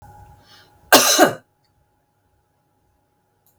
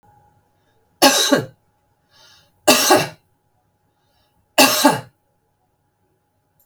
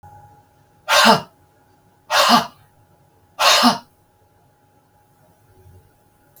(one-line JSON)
{"cough_length": "3.6 s", "cough_amplitude": 32768, "cough_signal_mean_std_ratio": 0.26, "three_cough_length": "6.7 s", "three_cough_amplitude": 32768, "three_cough_signal_mean_std_ratio": 0.33, "exhalation_length": "6.4 s", "exhalation_amplitude": 32768, "exhalation_signal_mean_std_ratio": 0.33, "survey_phase": "beta (2021-08-13 to 2022-03-07)", "age": "45-64", "gender": "Female", "wearing_mask": "No", "symptom_none": true, "smoker_status": "Ex-smoker", "respiratory_condition_asthma": false, "respiratory_condition_other": false, "recruitment_source": "REACT", "submission_delay": "1 day", "covid_test_result": "Negative", "covid_test_method": "RT-qPCR", "influenza_a_test_result": "Negative", "influenza_b_test_result": "Negative"}